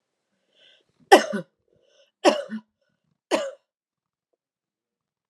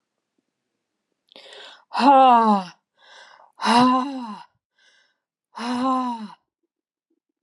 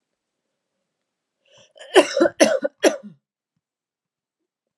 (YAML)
three_cough_length: 5.3 s
three_cough_amplitude: 32215
three_cough_signal_mean_std_ratio: 0.21
exhalation_length: 7.4 s
exhalation_amplitude: 21199
exhalation_signal_mean_std_ratio: 0.39
cough_length: 4.8 s
cough_amplitude: 31674
cough_signal_mean_std_ratio: 0.26
survey_phase: alpha (2021-03-01 to 2021-08-12)
age: 18-44
gender: Female
wearing_mask: 'No'
symptom_none: true
symptom_onset: 12 days
smoker_status: Never smoked
respiratory_condition_asthma: false
respiratory_condition_other: false
recruitment_source: REACT
submission_delay: 3 days
covid_test_result: Negative
covid_test_method: RT-qPCR